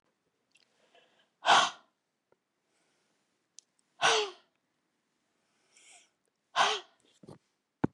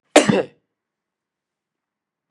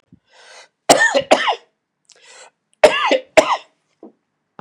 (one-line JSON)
{"exhalation_length": "7.9 s", "exhalation_amplitude": 10632, "exhalation_signal_mean_std_ratio": 0.24, "cough_length": "2.3 s", "cough_amplitude": 32768, "cough_signal_mean_std_ratio": 0.23, "three_cough_length": "4.6 s", "three_cough_amplitude": 32768, "three_cough_signal_mean_std_ratio": 0.36, "survey_phase": "beta (2021-08-13 to 2022-03-07)", "age": "65+", "gender": "Male", "wearing_mask": "No", "symptom_runny_or_blocked_nose": true, "symptom_abdominal_pain": true, "symptom_onset": "4 days", "smoker_status": "Never smoked", "respiratory_condition_asthma": false, "respiratory_condition_other": false, "recruitment_source": "Test and Trace", "submission_delay": "1 day", "covid_test_result": "Positive", "covid_test_method": "RT-qPCR", "covid_ct_value": 15.7, "covid_ct_gene": "ORF1ab gene", "covid_ct_mean": 15.9, "covid_viral_load": "6200000 copies/ml", "covid_viral_load_category": "High viral load (>1M copies/ml)"}